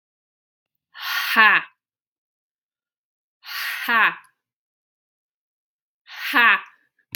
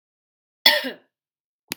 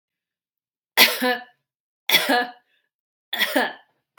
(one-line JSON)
{"exhalation_length": "7.2 s", "exhalation_amplitude": 32767, "exhalation_signal_mean_std_ratio": 0.32, "cough_length": "1.8 s", "cough_amplitude": 32768, "cough_signal_mean_std_ratio": 0.24, "three_cough_length": "4.2 s", "three_cough_amplitude": 32768, "three_cough_signal_mean_std_ratio": 0.37, "survey_phase": "beta (2021-08-13 to 2022-03-07)", "age": "18-44", "gender": "Female", "wearing_mask": "No", "symptom_none": true, "smoker_status": "Ex-smoker", "respiratory_condition_asthma": false, "respiratory_condition_other": false, "recruitment_source": "REACT", "submission_delay": "0 days", "covid_test_result": "Negative", "covid_test_method": "RT-qPCR", "influenza_a_test_result": "Unknown/Void", "influenza_b_test_result": "Unknown/Void"}